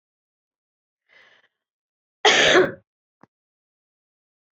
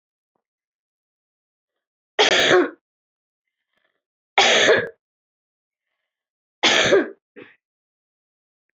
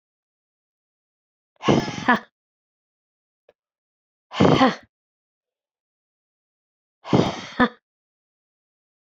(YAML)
cough_length: 4.5 s
cough_amplitude: 22833
cough_signal_mean_std_ratio: 0.25
three_cough_length: 8.8 s
three_cough_amplitude: 24129
three_cough_signal_mean_std_ratio: 0.32
exhalation_length: 9.0 s
exhalation_amplitude: 27198
exhalation_signal_mean_std_ratio: 0.26
survey_phase: beta (2021-08-13 to 2022-03-07)
age: 45-64
gender: Female
wearing_mask: 'No'
symptom_cough_any: true
symptom_runny_or_blocked_nose: true
symptom_fatigue: true
symptom_headache: true
symptom_change_to_sense_of_smell_or_taste: true
symptom_onset: 3 days
smoker_status: Never smoked
respiratory_condition_asthma: true
respiratory_condition_other: false
recruitment_source: Test and Trace
submission_delay: 2 days
covid_test_result: Positive
covid_test_method: LAMP